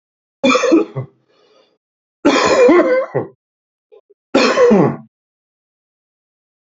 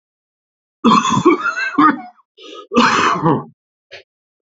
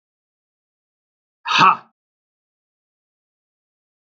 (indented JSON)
{
  "three_cough_length": "6.7 s",
  "three_cough_amplitude": 30567,
  "three_cough_signal_mean_std_ratio": 0.47,
  "cough_length": "4.5 s",
  "cough_amplitude": 29422,
  "cough_signal_mean_std_ratio": 0.51,
  "exhalation_length": "4.0 s",
  "exhalation_amplitude": 28813,
  "exhalation_signal_mean_std_ratio": 0.2,
  "survey_phase": "beta (2021-08-13 to 2022-03-07)",
  "age": "45-64",
  "gender": "Male",
  "wearing_mask": "No",
  "symptom_cough_any": true,
  "symptom_headache": true,
  "smoker_status": "Never smoked",
  "respiratory_condition_asthma": true,
  "respiratory_condition_other": false,
  "recruitment_source": "Test and Trace",
  "submission_delay": "1 day",
  "covid_test_result": "Positive",
  "covid_test_method": "RT-qPCR"
}